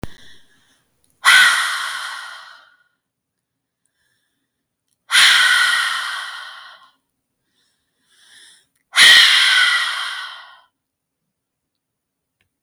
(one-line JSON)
{"exhalation_length": "12.6 s", "exhalation_amplitude": 32646, "exhalation_signal_mean_std_ratio": 0.39, "survey_phase": "beta (2021-08-13 to 2022-03-07)", "age": "18-44", "gender": "Female", "wearing_mask": "No", "symptom_sore_throat": true, "symptom_onset": "1 day", "smoker_status": "Ex-smoker", "respiratory_condition_asthma": false, "respiratory_condition_other": false, "recruitment_source": "Test and Trace", "submission_delay": "1 day", "covid_test_result": "Negative", "covid_test_method": "RT-qPCR"}